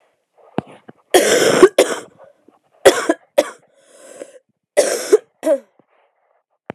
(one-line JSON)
{"three_cough_length": "6.7 s", "three_cough_amplitude": 32768, "three_cough_signal_mean_std_ratio": 0.35, "survey_phase": "beta (2021-08-13 to 2022-03-07)", "age": "18-44", "gender": "Female", "wearing_mask": "No", "symptom_cough_any": true, "symptom_sore_throat": true, "symptom_fatigue": true, "symptom_change_to_sense_of_smell_or_taste": true, "symptom_onset": "4 days", "smoker_status": "Never smoked", "respiratory_condition_asthma": false, "respiratory_condition_other": false, "recruitment_source": "Test and Trace", "submission_delay": "2 days", "covid_test_result": "Positive", "covid_test_method": "RT-qPCR", "covid_ct_value": 15.8, "covid_ct_gene": "ORF1ab gene", "covid_ct_mean": 16.2, "covid_viral_load": "4900000 copies/ml", "covid_viral_load_category": "High viral load (>1M copies/ml)"}